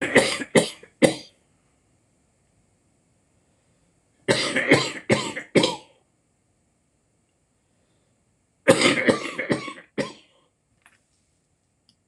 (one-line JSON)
{"three_cough_length": "12.1 s", "three_cough_amplitude": 26027, "three_cough_signal_mean_std_ratio": 0.32, "survey_phase": "beta (2021-08-13 to 2022-03-07)", "age": "65+", "gender": "Male", "wearing_mask": "No", "symptom_cough_any": true, "symptom_runny_or_blocked_nose": true, "symptom_fatigue": true, "symptom_change_to_sense_of_smell_or_taste": true, "smoker_status": "Never smoked", "respiratory_condition_asthma": true, "respiratory_condition_other": false, "recruitment_source": "Test and Trace", "submission_delay": "1 day", "covid_test_result": "Positive", "covid_test_method": "LFT"}